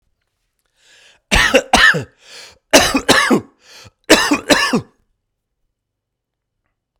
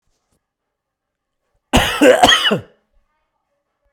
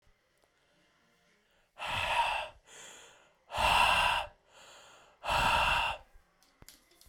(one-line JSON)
{"three_cough_length": "7.0 s", "three_cough_amplitude": 32768, "three_cough_signal_mean_std_ratio": 0.39, "cough_length": "3.9 s", "cough_amplitude": 32768, "cough_signal_mean_std_ratio": 0.35, "exhalation_length": "7.1 s", "exhalation_amplitude": 7205, "exhalation_signal_mean_std_ratio": 0.47, "survey_phase": "beta (2021-08-13 to 2022-03-07)", "age": "45-64", "gender": "Male", "wearing_mask": "No", "symptom_none": true, "smoker_status": "Ex-smoker", "respiratory_condition_asthma": false, "respiratory_condition_other": false, "recruitment_source": "REACT", "submission_delay": "2 days", "covid_test_result": "Negative", "covid_test_method": "RT-qPCR"}